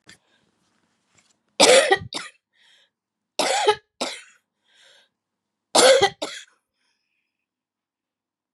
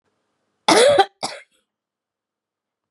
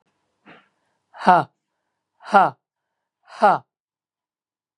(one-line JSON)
{"three_cough_length": "8.5 s", "three_cough_amplitude": 32730, "three_cough_signal_mean_std_ratio": 0.29, "cough_length": "2.9 s", "cough_amplitude": 28756, "cough_signal_mean_std_ratio": 0.31, "exhalation_length": "4.8 s", "exhalation_amplitude": 32692, "exhalation_signal_mean_std_ratio": 0.25, "survey_phase": "beta (2021-08-13 to 2022-03-07)", "age": "65+", "gender": "Female", "wearing_mask": "No", "symptom_cough_any": true, "symptom_runny_or_blocked_nose": true, "symptom_shortness_of_breath": true, "symptom_sore_throat": true, "symptom_diarrhoea": true, "symptom_fatigue": true, "symptom_fever_high_temperature": true, "symptom_headache": true, "symptom_onset": "3 days", "smoker_status": "Ex-smoker", "respiratory_condition_asthma": true, "respiratory_condition_other": false, "recruitment_source": "Test and Trace", "submission_delay": "1 day", "covid_test_result": "Positive", "covid_test_method": "RT-qPCR", "covid_ct_value": 16.8, "covid_ct_gene": "ORF1ab gene", "covid_ct_mean": 17.0, "covid_viral_load": "2600000 copies/ml", "covid_viral_load_category": "High viral load (>1M copies/ml)"}